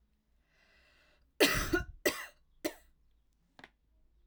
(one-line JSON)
{"three_cough_length": "4.3 s", "three_cough_amplitude": 11352, "three_cough_signal_mean_std_ratio": 0.29, "survey_phase": "alpha (2021-03-01 to 2021-08-12)", "age": "18-44", "gender": "Female", "wearing_mask": "No", "symptom_none": true, "smoker_status": "Never smoked", "respiratory_condition_asthma": false, "respiratory_condition_other": false, "recruitment_source": "REACT", "submission_delay": "1 day", "covid_test_result": "Negative", "covid_test_method": "RT-qPCR"}